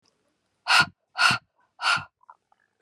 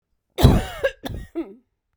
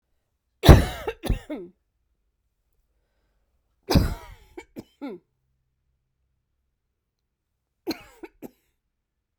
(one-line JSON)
{"exhalation_length": "2.8 s", "exhalation_amplitude": 17734, "exhalation_signal_mean_std_ratio": 0.35, "cough_length": "2.0 s", "cough_amplitude": 32768, "cough_signal_mean_std_ratio": 0.38, "three_cough_length": "9.4 s", "three_cough_amplitude": 32768, "three_cough_signal_mean_std_ratio": 0.19, "survey_phase": "beta (2021-08-13 to 2022-03-07)", "age": "45-64", "gender": "Female", "wearing_mask": "No", "symptom_none": true, "smoker_status": "Never smoked", "respiratory_condition_asthma": false, "respiratory_condition_other": false, "recruitment_source": "REACT", "submission_delay": "2 days", "covid_test_result": "Negative", "covid_test_method": "RT-qPCR", "influenza_a_test_result": "Negative", "influenza_b_test_result": "Negative"}